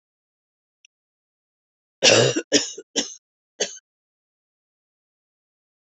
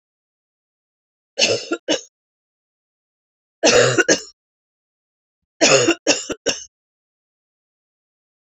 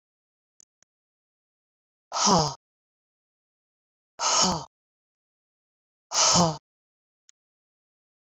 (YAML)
cough_length: 5.8 s
cough_amplitude: 26967
cough_signal_mean_std_ratio: 0.25
three_cough_length: 8.4 s
three_cough_amplitude: 32767
three_cough_signal_mean_std_ratio: 0.32
exhalation_length: 8.3 s
exhalation_amplitude: 15444
exhalation_signal_mean_std_ratio: 0.29
survey_phase: beta (2021-08-13 to 2022-03-07)
age: 45-64
gender: Female
wearing_mask: 'No'
symptom_cough_any: true
symptom_runny_or_blocked_nose: true
symptom_sore_throat: true
symptom_fatigue: true
symptom_headache: true
symptom_change_to_sense_of_smell_or_taste: true
symptom_onset: 2 days
smoker_status: Never smoked
respiratory_condition_asthma: false
respiratory_condition_other: false
recruitment_source: Test and Trace
submission_delay: 1 day
covid_test_result: Positive
covid_test_method: RT-qPCR
covid_ct_value: 22.6
covid_ct_gene: ORF1ab gene
covid_ct_mean: 23.1
covid_viral_load: 27000 copies/ml
covid_viral_load_category: Low viral load (10K-1M copies/ml)